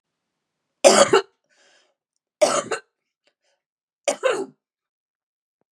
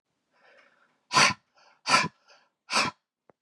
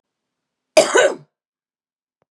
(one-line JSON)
{"three_cough_length": "5.7 s", "three_cough_amplitude": 32768, "three_cough_signal_mean_std_ratio": 0.28, "exhalation_length": "3.4 s", "exhalation_amplitude": 18424, "exhalation_signal_mean_std_ratio": 0.32, "cough_length": "2.3 s", "cough_amplitude": 32639, "cough_signal_mean_std_ratio": 0.29, "survey_phase": "beta (2021-08-13 to 2022-03-07)", "age": "45-64", "gender": "Female", "wearing_mask": "No", "symptom_cough_any": true, "symptom_sore_throat": true, "symptom_fatigue": true, "symptom_headache": true, "symptom_change_to_sense_of_smell_or_taste": true, "smoker_status": "Ex-smoker", "respiratory_condition_asthma": false, "respiratory_condition_other": false, "recruitment_source": "Test and Trace", "submission_delay": "2 days", "covid_test_result": "Positive", "covid_test_method": "LFT"}